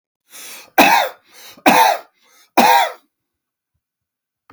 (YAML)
three_cough_length: 4.5 s
three_cough_amplitude: 32768
three_cough_signal_mean_std_ratio: 0.39
survey_phase: beta (2021-08-13 to 2022-03-07)
age: 45-64
gender: Male
wearing_mask: 'No'
symptom_none: true
smoker_status: Never smoked
respiratory_condition_asthma: true
respiratory_condition_other: false
recruitment_source: REACT
submission_delay: 1 day
covid_test_result: Negative
covid_test_method: RT-qPCR
influenza_a_test_result: Negative
influenza_b_test_result: Negative